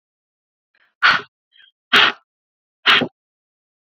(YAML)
exhalation_length: 3.8 s
exhalation_amplitude: 30425
exhalation_signal_mean_std_ratio: 0.3
survey_phase: beta (2021-08-13 to 2022-03-07)
age: 18-44
gender: Female
wearing_mask: 'No'
symptom_shortness_of_breath: true
symptom_abdominal_pain: true
symptom_diarrhoea: true
symptom_fatigue: true
symptom_headache: true
symptom_other: true
symptom_onset: 5 days
smoker_status: Ex-smoker
respiratory_condition_asthma: true
respiratory_condition_other: false
recruitment_source: REACT
submission_delay: 1 day
covid_test_result: Negative
covid_test_method: RT-qPCR